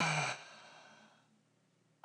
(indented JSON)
{
  "exhalation_length": "2.0 s",
  "exhalation_amplitude": 2721,
  "exhalation_signal_mean_std_ratio": 0.41,
  "survey_phase": "beta (2021-08-13 to 2022-03-07)",
  "age": "45-64",
  "gender": "Female",
  "wearing_mask": "No",
  "symptom_none": true,
  "smoker_status": "Never smoked",
  "respiratory_condition_asthma": true,
  "respiratory_condition_other": false,
  "recruitment_source": "REACT",
  "submission_delay": "16 days",
  "covid_test_result": "Negative",
  "covid_test_method": "RT-qPCR",
  "influenza_a_test_result": "Negative",
  "influenza_b_test_result": "Negative"
}